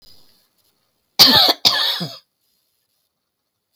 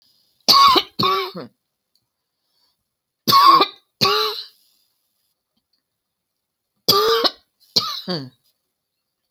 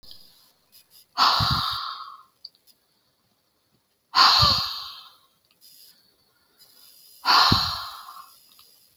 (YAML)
cough_length: 3.8 s
cough_amplitude: 32767
cough_signal_mean_std_ratio: 0.33
three_cough_length: 9.3 s
three_cough_amplitude: 32628
three_cough_signal_mean_std_ratio: 0.37
exhalation_length: 9.0 s
exhalation_amplitude: 24435
exhalation_signal_mean_std_ratio: 0.38
survey_phase: alpha (2021-03-01 to 2021-08-12)
age: 45-64
gender: Female
wearing_mask: 'No'
symptom_none: true
smoker_status: Never smoked
respiratory_condition_asthma: false
respiratory_condition_other: false
recruitment_source: REACT
submission_delay: 1 day
covid_test_result: Negative
covid_test_method: RT-qPCR